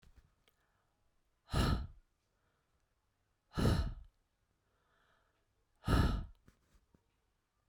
{"exhalation_length": "7.7 s", "exhalation_amplitude": 3514, "exhalation_signal_mean_std_ratio": 0.31, "survey_phase": "beta (2021-08-13 to 2022-03-07)", "age": "45-64", "gender": "Female", "wearing_mask": "No", "symptom_none": true, "smoker_status": "Ex-smoker", "respiratory_condition_asthma": false, "respiratory_condition_other": false, "recruitment_source": "REACT", "submission_delay": "1 day", "covid_test_result": "Negative", "covid_test_method": "RT-qPCR"}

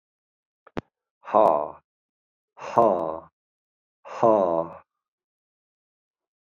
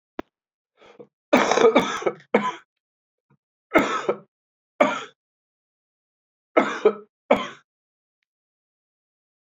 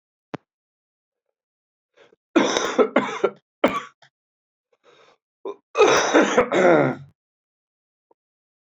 {"exhalation_length": "6.5 s", "exhalation_amplitude": 25432, "exhalation_signal_mean_std_ratio": 0.32, "three_cough_length": "9.6 s", "three_cough_amplitude": 25683, "three_cough_signal_mean_std_ratio": 0.32, "cough_length": "8.6 s", "cough_amplitude": 26403, "cough_signal_mean_std_ratio": 0.37, "survey_phase": "alpha (2021-03-01 to 2021-08-12)", "age": "65+", "gender": "Male", "wearing_mask": "Yes", "symptom_cough_any": true, "symptom_new_continuous_cough": true, "symptom_fatigue": true, "symptom_onset": "3 days", "smoker_status": "Never smoked", "respiratory_condition_asthma": false, "respiratory_condition_other": false, "recruitment_source": "Test and Trace", "submission_delay": "2 days", "covid_test_result": "Positive", "covid_test_method": "RT-qPCR", "covid_ct_value": 19.7, "covid_ct_gene": "ORF1ab gene"}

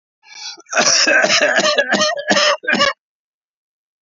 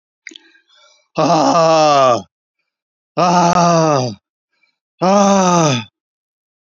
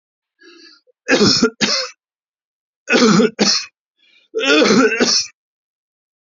{"cough_length": "4.0 s", "cough_amplitude": 31905, "cough_signal_mean_std_ratio": 0.64, "exhalation_length": "6.7 s", "exhalation_amplitude": 26620, "exhalation_signal_mean_std_ratio": 0.59, "three_cough_length": "6.2 s", "three_cough_amplitude": 28029, "three_cough_signal_mean_std_ratio": 0.5, "survey_phase": "beta (2021-08-13 to 2022-03-07)", "age": "65+", "gender": "Male", "wearing_mask": "No", "symptom_none": true, "smoker_status": "Never smoked", "respiratory_condition_asthma": false, "respiratory_condition_other": false, "recruitment_source": "REACT", "submission_delay": "3 days", "covid_test_result": "Negative", "covid_test_method": "RT-qPCR"}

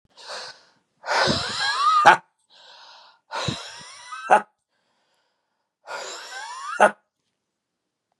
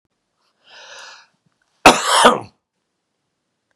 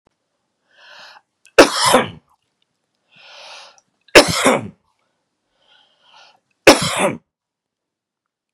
{"exhalation_length": "8.2 s", "exhalation_amplitude": 32767, "exhalation_signal_mean_std_ratio": 0.35, "cough_length": "3.8 s", "cough_amplitude": 32768, "cough_signal_mean_std_ratio": 0.27, "three_cough_length": "8.5 s", "three_cough_amplitude": 32768, "three_cough_signal_mean_std_ratio": 0.27, "survey_phase": "beta (2021-08-13 to 2022-03-07)", "age": "45-64", "gender": "Male", "wearing_mask": "No", "symptom_abdominal_pain": true, "smoker_status": "Never smoked", "respiratory_condition_asthma": false, "respiratory_condition_other": false, "recruitment_source": "REACT", "submission_delay": "2 days", "covid_test_result": "Negative", "covid_test_method": "RT-qPCR"}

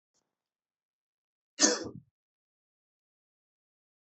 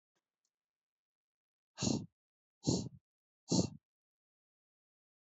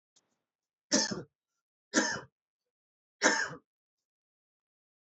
{"cough_length": "4.1 s", "cough_amplitude": 17079, "cough_signal_mean_std_ratio": 0.17, "exhalation_length": "5.3 s", "exhalation_amplitude": 4070, "exhalation_signal_mean_std_ratio": 0.26, "three_cough_length": "5.1 s", "three_cough_amplitude": 11774, "three_cough_signal_mean_std_ratio": 0.29, "survey_phase": "beta (2021-08-13 to 2022-03-07)", "age": "18-44", "gender": "Male", "wearing_mask": "No", "symptom_cough_any": true, "symptom_runny_or_blocked_nose": true, "symptom_sore_throat": true, "symptom_onset": "3 days", "smoker_status": "Never smoked", "respiratory_condition_asthma": false, "respiratory_condition_other": false, "recruitment_source": "Test and Trace", "submission_delay": "2 days", "covid_test_result": "Positive", "covid_test_method": "RT-qPCR", "covid_ct_value": 15.0, "covid_ct_gene": "ORF1ab gene", "covid_ct_mean": 15.3, "covid_viral_load": "9900000 copies/ml", "covid_viral_load_category": "High viral load (>1M copies/ml)"}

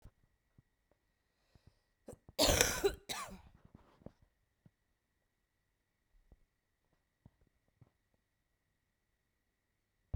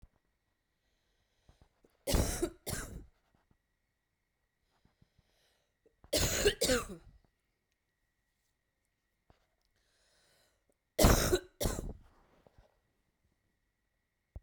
{"cough_length": "10.2 s", "cough_amplitude": 16083, "cough_signal_mean_std_ratio": 0.2, "three_cough_length": "14.4 s", "three_cough_amplitude": 10091, "three_cough_signal_mean_std_ratio": 0.27, "survey_phase": "beta (2021-08-13 to 2022-03-07)", "age": "18-44", "gender": "Female", "wearing_mask": "No", "symptom_cough_any": true, "symptom_runny_or_blocked_nose": true, "symptom_sore_throat": true, "symptom_fatigue": true, "symptom_fever_high_temperature": true, "symptom_headache": true, "symptom_change_to_sense_of_smell_or_taste": true, "symptom_other": true, "symptom_onset": "4 days", "smoker_status": "Ex-smoker", "respiratory_condition_asthma": false, "respiratory_condition_other": false, "recruitment_source": "Test and Trace", "submission_delay": "1 day", "covid_test_result": "Positive", "covid_test_method": "RT-qPCR", "covid_ct_value": 17.8, "covid_ct_gene": "ORF1ab gene", "covid_ct_mean": 18.7, "covid_viral_load": "760000 copies/ml", "covid_viral_load_category": "Low viral load (10K-1M copies/ml)"}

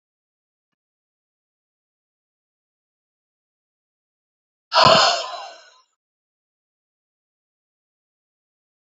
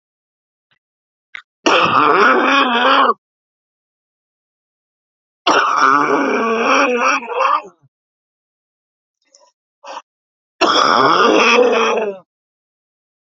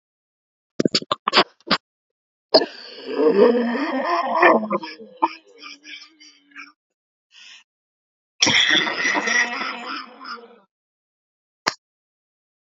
{"exhalation_length": "8.9 s", "exhalation_amplitude": 31154, "exhalation_signal_mean_std_ratio": 0.19, "three_cough_length": "13.3 s", "three_cough_amplitude": 31635, "three_cough_signal_mean_std_ratio": 0.54, "cough_length": "12.7 s", "cough_amplitude": 32768, "cough_signal_mean_std_ratio": 0.42, "survey_phase": "alpha (2021-03-01 to 2021-08-12)", "age": "45-64", "gender": "Female", "wearing_mask": "No", "symptom_cough_any": true, "symptom_new_continuous_cough": true, "symptom_fatigue": true, "symptom_headache": true, "symptom_change_to_sense_of_smell_or_taste": true, "symptom_loss_of_taste": true, "symptom_onset": "5 days", "smoker_status": "Current smoker (11 or more cigarettes per day)", "respiratory_condition_asthma": false, "respiratory_condition_other": false, "recruitment_source": "Test and Trace", "submission_delay": "2 days", "covid_test_result": "Positive", "covid_test_method": "RT-qPCR", "covid_ct_value": 15.4, "covid_ct_gene": "N gene", "covid_ct_mean": 15.5, "covid_viral_load": "8200000 copies/ml", "covid_viral_load_category": "High viral load (>1M copies/ml)"}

